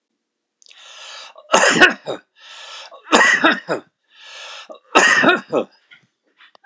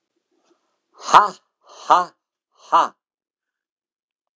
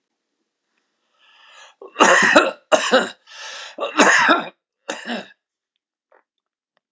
{"three_cough_length": "6.7 s", "three_cough_amplitude": 32768, "three_cough_signal_mean_std_ratio": 0.41, "exhalation_length": "4.4 s", "exhalation_amplitude": 32768, "exhalation_signal_mean_std_ratio": 0.24, "cough_length": "6.9 s", "cough_amplitude": 32768, "cough_signal_mean_std_ratio": 0.38, "survey_phase": "beta (2021-08-13 to 2022-03-07)", "age": "65+", "gender": "Male", "wearing_mask": "No", "symptom_none": true, "symptom_onset": "12 days", "smoker_status": "Never smoked", "respiratory_condition_asthma": false, "respiratory_condition_other": false, "recruitment_source": "REACT", "submission_delay": "1 day", "covid_test_result": "Negative", "covid_test_method": "RT-qPCR", "influenza_a_test_result": "Negative", "influenza_b_test_result": "Negative"}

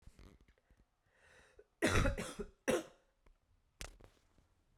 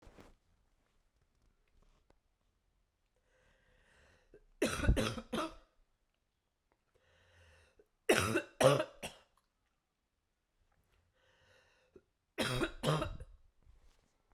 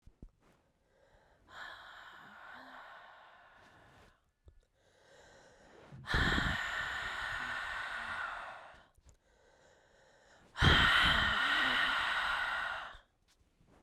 {"cough_length": "4.8 s", "cough_amplitude": 3864, "cough_signal_mean_std_ratio": 0.32, "three_cough_length": "14.3 s", "three_cough_amplitude": 7854, "three_cough_signal_mean_std_ratio": 0.28, "exhalation_length": "13.8 s", "exhalation_amplitude": 7629, "exhalation_signal_mean_std_ratio": 0.48, "survey_phase": "beta (2021-08-13 to 2022-03-07)", "age": "18-44", "gender": "Female", "wearing_mask": "No", "symptom_cough_any": true, "symptom_fatigue": true, "smoker_status": "Never smoked", "respiratory_condition_asthma": false, "respiratory_condition_other": false, "recruitment_source": "Test and Trace", "submission_delay": "2 days", "covid_test_result": "Positive", "covid_test_method": "LFT"}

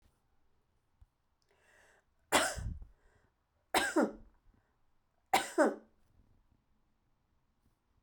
{"three_cough_length": "8.0 s", "three_cough_amplitude": 8234, "three_cough_signal_mean_std_ratio": 0.28, "survey_phase": "beta (2021-08-13 to 2022-03-07)", "age": "45-64", "gender": "Female", "wearing_mask": "No", "symptom_sore_throat": true, "smoker_status": "Never smoked", "respiratory_condition_asthma": true, "respiratory_condition_other": false, "recruitment_source": "REACT", "submission_delay": "5 days", "covid_test_result": "Negative", "covid_test_method": "RT-qPCR"}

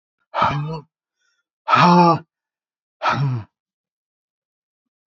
{"exhalation_length": "5.1 s", "exhalation_amplitude": 26518, "exhalation_signal_mean_std_ratio": 0.38, "survey_phase": "beta (2021-08-13 to 2022-03-07)", "age": "18-44", "gender": "Male", "wearing_mask": "No", "symptom_none": true, "smoker_status": "Never smoked", "respiratory_condition_asthma": false, "respiratory_condition_other": false, "recruitment_source": "REACT", "submission_delay": "1 day", "covid_test_result": "Negative", "covid_test_method": "RT-qPCR"}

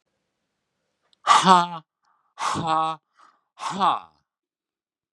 {"exhalation_length": "5.1 s", "exhalation_amplitude": 30653, "exhalation_signal_mean_std_ratio": 0.34, "survey_phase": "beta (2021-08-13 to 2022-03-07)", "age": "65+", "gender": "Male", "wearing_mask": "No", "symptom_none": true, "smoker_status": "Ex-smoker", "respiratory_condition_asthma": false, "respiratory_condition_other": false, "recruitment_source": "REACT", "submission_delay": "1 day", "covid_test_result": "Negative", "covid_test_method": "RT-qPCR", "influenza_a_test_result": "Negative", "influenza_b_test_result": "Negative"}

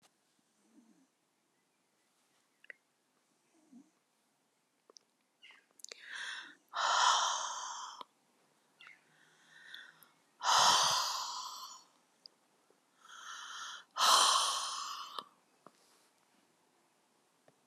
{"exhalation_length": "17.7 s", "exhalation_amplitude": 8854, "exhalation_signal_mean_std_ratio": 0.35, "survey_phase": "alpha (2021-03-01 to 2021-08-12)", "age": "65+", "gender": "Female", "wearing_mask": "No", "symptom_cough_any": true, "symptom_fatigue": true, "symptom_headache": true, "smoker_status": "Never smoked", "respiratory_condition_asthma": true, "respiratory_condition_other": false, "recruitment_source": "REACT", "submission_delay": "3 days", "covid_test_result": "Negative", "covid_test_method": "RT-qPCR"}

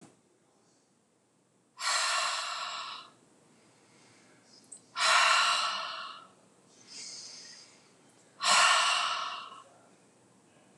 {"exhalation_length": "10.8 s", "exhalation_amplitude": 8623, "exhalation_signal_mean_std_ratio": 0.45, "survey_phase": "beta (2021-08-13 to 2022-03-07)", "age": "45-64", "gender": "Female", "wearing_mask": "No", "symptom_none": true, "smoker_status": "Ex-smoker", "respiratory_condition_asthma": false, "respiratory_condition_other": false, "recruitment_source": "REACT", "submission_delay": "1 day", "covid_test_result": "Negative", "covid_test_method": "RT-qPCR", "influenza_a_test_result": "Unknown/Void", "influenza_b_test_result": "Unknown/Void"}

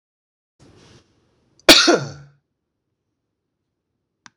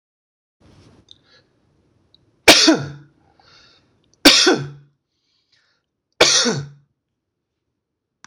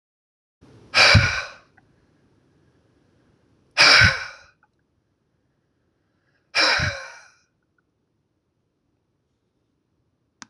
{"cough_length": "4.4 s", "cough_amplitude": 26028, "cough_signal_mean_std_ratio": 0.21, "three_cough_length": "8.3 s", "three_cough_amplitude": 26028, "three_cough_signal_mean_std_ratio": 0.28, "exhalation_length": "10.5 s", "exhalation_amplitude": 26018, "exhalation_signal_mean_std_ratio": 0.27, "survey_phase": "beta (2021-08-13 to 2022-03-07)", "age": "45-64", "gender": "Male", "wearing_mask": "No", "symptom_none": true, "symptom_onset": "2 days", "smoker_status": "Ex-smoker", "respiratory_condition_asthma": false, "respiratory_condition_other": false, "recruitment_source": "Test and Trace", "submission_delay": "1 day", "covid_test_result": "Positive", "covid_test_method": "RT-qPCR"}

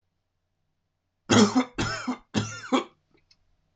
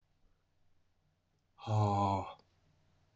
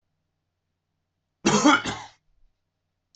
{"three_cough_length": "3.8 s", "three_cough_amplitude": 17999, "three_cough_signal_mean_std_ratio": 0.36, "exhalation_length": "3.2 s", "exhalation_amplitude": 3232, "exhalation_signal_mean_std_ratio": 0.38, "cough_length": "3.2 s", "cough_amplitude": 17334, "cough_signal_mean_std_ratio": 0.29, "survey_phase": "beta (2021-08-13 to 2022-03-07)", "age": "45-64", "gender": "Male", "wearing_mask": "No", "symptom_runny_or_blocked_nose": true, "symptom_onset": "4 days", "smoker_status": "Ex-smoker", "respiratory_condition_asthma": false, "respiratory_condition_other": false, "recruitment_source": "REACT", "submission_delay": "2 days", "covid_test_result": "Negative", "covid_test_method": "RT-qPCR"}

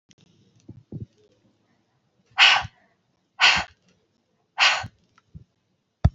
{"exhalation_length": "6.1 s", "exhalation_amplitude": 26479, "exhalation_signal_mean_std_ratio": 0.28, "survey_phase": "alpha (2021-03-01 to 2021-08-12)", "age": "45-64", "gender": "Female", "wearing_mask": "No", "symptom_none": true, "smoker_status": "Never smoked", "respiratory_condition_asthma": false, "respiratory_condition_other": false, "recruitment_source": "REACT", "submission_delay": "1 day", "covid_test_result": "Negative", "covid_test_method": "RT-qPCR"}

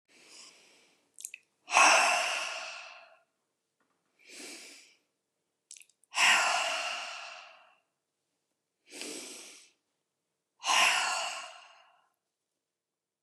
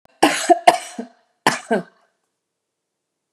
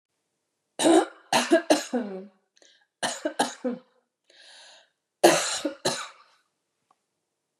{"exhalation_length": "13.2 s", "exhalation_amplitude": 13710, "exhalation_signal_mean_std_ratio": 0.36, "cough_length": "3.3 s", "cough_amplitude": 32768, "cough_signal_mean_std_ratio": 0.3, "three_cough_length": "7.6 s", "three_cough_amplitude": 25016, "three_cough_signal_mean_std_ratio": 0.36, "survey_phase": "beta (2021-08-13 to 2022-03-07)", "age": "65+", "gender": "Female", "wearing_mask": "No", "symptom_runny_or_blocked_nose": true, "symptom_onset": "12 days", "smoker_status": "Never smoked", "respiratory_condition_asthma": false, "respiratory_condition_other": false, "recruitment_source": "REACT", "submission_delay": "2 days", "covid_test_result": "Negative", "covid_test_method": "RT-qPCR", "influenza_a_test_result": "Negative", "influenza_b_test_result": "Negative"}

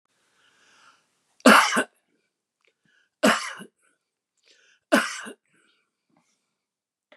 {"three_cough_length": "7.2 s", "three_cough_amplitude": 32655, "three_cough_signal_mean_std_ratio": 0.24, "survey_phase": "beta (2021-08-13 to 2022-03-07)", "age": "65+", "gender": "Male", "wearing_mask": "No", "symptom_none": true, "smoker_status": "Ex-smoker", "respiratory_condition_asthma": false, "respiratory_condition_other": false, "recruitment_source": "REACT", "submission_delay": "4 days", "covid_test_result": "Negative", "covid_test_method": "RT-qPCR", "influenza_a_test_result": "Negative", "influenza_b_test_result": "Negative"}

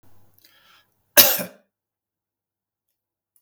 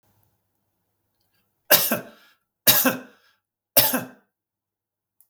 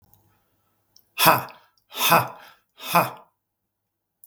{"cough_length": "3.4 s", "cough_amplitude": 32768, "cough_signal_mean_std_ratio": 0.19, "three_cough_length": "5.3 s", "three_cough_amplitude": 32768, "three_cough_signal_mean_std_ratio": 0.28, "exhalation_length": "4.3 s", "exhalation_amplitude": 32766, "exhalation_signal_mean_std_ratio": 0.31, "survey_phase": "beta (2021-08-13 to 2022-03-07)", "age": "65+", "gender": "Male", "wearing_mask": "No", "symptom_none": true, "smoker_status": "Never smoked", "respiratory_condition_asthma": false, "respiratory_condition_other": false, "recruitment_source": "REACT", "submission_delay": "2 days", "covid_test_result": "Negative", "covid_test_method": "RT-qPCR", "influenza_a_test_result": "Negative", "influenza_b_test_result": "Negative"}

